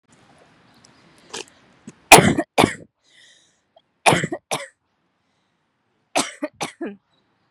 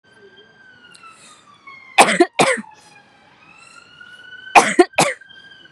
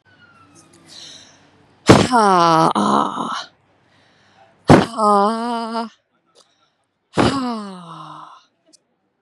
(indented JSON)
{
  "three_cough_length": "7.5 s",
  "three_cough_amplitude": 32768,
  "three_cough_signal_mean_std_ratio": 0.24,
  "cough_length": "5.7 s",
  "cough_amplitude": 32768,
  "cough_signal_mean_std_ratio": 0.3,
  "exhalation_length": "9.2 s",
  "exhalation_amplitude": 32768,
  "exhalation_signal_mean_std_ratio": 0.4,
  "survey_phase": "beta (2021-08-13 to 2022-03-07)",
  "age": "18-44",
  "gender": "Female",
  "wearing_mask": "No",
  "symptom_none": true,
  "smoker_status": "Ex-smoker",
  "respiratory_condition_asthma": false,
  "respiratory_condition_other": false,
  "recruitment_source": "REACT",
  "submission_delay": "0 days",
  "covid_test_result": "Negative",
  "covid_test_method": "RT-qPCR",
  "influenza_a_test_result": "Negative",
  "influenza_b_test_result": "Negative"
}